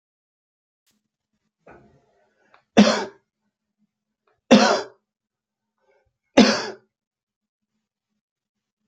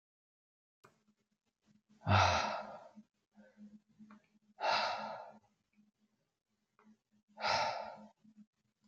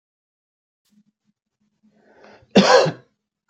{"three_cough_length": "8.9 s", "three_cough_amplitude": 28195, "three_cough_signal_mean_std_ratio": 0.22, "exhalation_length": "8.9 s", "exhalation_amplitude": 6138, "exhalation_signal_mean_std_ratio": 0.34, "cough_length": "3.5 s", "cough_amplitude": 28942, "cough_signal_mean_std_ratio": 0.26, "survey_phase": "beta (2021-08-13 to 2022-03-07)", "age": "45-64", "gender": "Male", "wearing_mask": "No", "symptom_none": true, "smoker_status": "Ex-smoker", "respiratory_condition_asthma": false, "respiratory_condition_other": false, "recruitment_source": "REACT", "submission_delay": "3 days", "covid_test_result": "Negative", "covid_test_method": "RT-qPCR", "influenza_a_test_result": "Unknown/Void", "influenza_b_test_result": "Unknown/Void"}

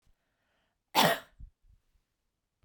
{"cough_length": "2.6 s", "cough_amplitude": 12003, "cough_signal_mean_std_ratio": 0.24, "survey_phase": "beta (2021-08-13 to 2022-03-07)", "age": "45-64", "gender": "Female", "wearing_mask": "No", "symptom_sore_throat": true, "symptom_onset": "13 days", "smoker_status": "Never smoked", "respiratory_condition_asthma": false, "respiratory_condition_other": false, "recruitment_source": "REACT", "submission_delay": "2 days", "covid_test_result": "Negative", "covid_test_method": "RT-qPCR"}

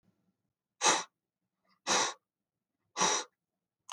{"exhalation_length": "3.9 s", "exhalation_amplitude": 6859, "exhalation_signal_mean_std_ratio": 0.34, "survey_phase": "beta (2021-08-13 to 2022-03-07)", "age": "65+", "gender": "Male", "wearing_mask": "No", "symptom_none": true, "smoker_status": "Ex-smoker", "respiratory_condition_asthma": false, "respiratory_condition_other": false, "recruitment_source": "REACT", "submission_delay": "3 days", "covid_test_result": "Negative", "covid_test_method": "RT-qPCR", "influenza_a_test_result": "Negative", "influenza_b_test_result": "Negative"}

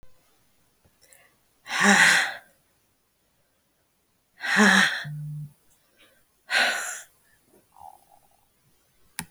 {"exhalation_length": "9.3 s", "exhalation_amplitude": 25706, "exhalation_signal_mean_std_ratio": 0.34, "survey_phase": "beta (2021-08-13 to 2022-03-07)", "age": "45-64", "gender": "Female", "wearing_mask": "No", "symptom_none": true, "smoker_status": "Never smoked", "respiratory_condition_asthma": false, "respiratory_condition_other": false, "recruitment_source": "REACT", "submission_delay": "1 day", "covid_test_result": "Negative", "covid_test_method": "RT-qPCR"}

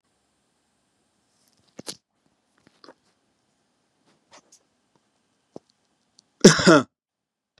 {"cough_length": "7.6 s", "cough_amplitude": 32767, "cough_signal_mean_std_ratio": 0.16, "survey_phase": "beta (2021-08-13 to 2022-03-07)", "age": "65+", "gender": "Male", "wearing_mask": "No", "symptom_none": true, "smoker_status": "Never smoked", "respiratory_condition_asthma": false, "respiratory_condition_other": false, "recruitment_source": "REACT", "submission_delay": "2 days", "covid_test_result": "Negative", "covid_test_method": "RT-qPCR", "influenza_a_test_result": "Negative", "influenza_b_test_result": "Negative"}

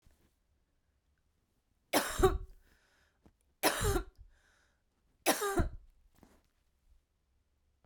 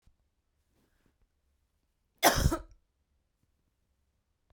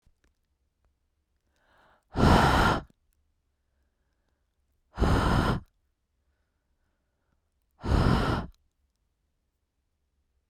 {"three_cough_length": "7.9 s", "three_cough_amplitude": 7277, "three_cough_signal_mean_std_ratio": 0.31, "cough_length": "4.5 s", "cough_amplitude": 16284, "cough_signal_mean_std_ratio": 0.2, "exhalation_length": "10.5 s", "exhalation_amplitude": 14161, "exhalation_signal_mean_std_ratio": 0.34, "survey_phase": "beta (2021-08-13 to 2022-03-07)", "age": "18-44", "gender": "Female", "wearing_mask": "No", "symptom_none": true, "smoker_status": "Current smoker (1 to 10 cigarettes per day)", "respiratory_condition_asthma": false, "respiratory_condition_other": false, "recruitment_source": "REACT", "submission_delay": "1 day", "covid_test_result": "Negative", "covid_test_method": "RT-qPCR", "influenza_a_test_result": "Negative", "influenza_b_test_result": "Negative"}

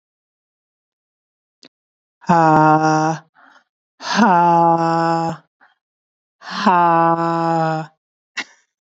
{"exhalation_length": "9.0 s", "exhalation_amplitude": 31500, "exhalation_signal_mean_std_ratio": 0.49, "survey_phase": "beta (2021-08-13 to 2022-03-07)", "age": "18-44", "gender": "Female", "wearing_mask": "No", "symptom_new_continuous_cough": true, "symptom_runny_or_blocked_nose": true, "symptom_fatigue": true, "symptom_headache": true, "symptom_onset": "3 days", "smoker_status": "Never smoked", "respiratory_condition_asthma": false, "respiratory_condition_other": false, "recruitment_source": "Test and Trace", "submission_delay": "2 days", "covid_test_result": "Positive", "covid_test_method": "RT-qPCR", "covid_ct_value": 27.0, "covid_ct_gene": "N gene"}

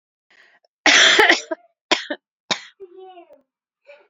{"cough_length": "4.1 s", "cough_amplitude": 32767, "cough_signal_mean_std_ratio": 0.34, "survey_phase": "alpha (2021-03-01 to 2021-08-12)", "age": "18-44", "gender": "Female", "wearing_mask": "No", "symptom_abdominal_pain": true, "symptom_fatigue": true, "smoker_status": "Never smoked", "respiratory_condition_asthma": false, "respiratory_condition_other": false, "recruitment_source": "REACT", "submission_delay": "2 days", "covid_test_result": "Negative", "covid_test_method": "RT-qPCR"}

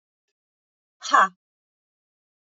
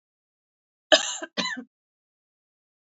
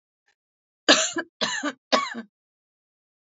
{"exhalation_length": "2.5 s", "exhalation_amplitude": 20816, "exhalation_signal_mean_std_ratio": 0.21, "cough_length": "2.8 s", "cough_amplitude": 26060, "cough_signal_mean_std_ratio": 0.24, "three_cough_length": "3.2 s", "three_cough_amplitude": 26823, "three_cough_signal_mean_std_ratio": 0.34, "survey_phase": "beta (2021-08-13 to 2022-03-07)", "age": "45-64", "gender": "Female", "wearing_mask": "No", "symptom_runny_or_blocked_nose": true, "symptom_fatigue": true, "symptom_other": true, "symptom_onset": "3 days", "smoker_status": "Ex-smoker", "respiratory_condition_asthma": false, "respiratory_condition_other": false, "recruitment_source": "Test and Trace", "submission_delay": "1 day", "covid_test_result": "Positive", "covid_test_method": "RT-qPCR", "covid_ct_value": 21.0, "covid_ct_gene": "ORF1ab gene", "covid_ct_mean": 21.5, "covid_viral_load": "90000 copies/ml", "covid_viral_load_category": "Low viral load (10K-1M copies/ml)"}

